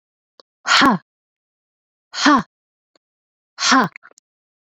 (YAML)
exhalation_length: 4.7 s
exhalation_amplitude: 27423
exhalation_signal_mean_std_ratio: 0.33
survey_phase: beta (2021-08-13 to 2022-03-07)
age: 45-64
gender: Female
wearing_mask: 'No'
symptom_runny_or_blocked_nose: true
symptom_abdominal_pain: true
symptom_headache: true
symptom_change_to_sense_of_smell_or_taste: true
smoker_status: Never smoked
respiratory_condition_asthma: false
respiratory_condition_other: false
recruitment_source: Test and Trace
submission_delay: 2 days
covid_test_result: Positive
covid_test_method: RT-qPCR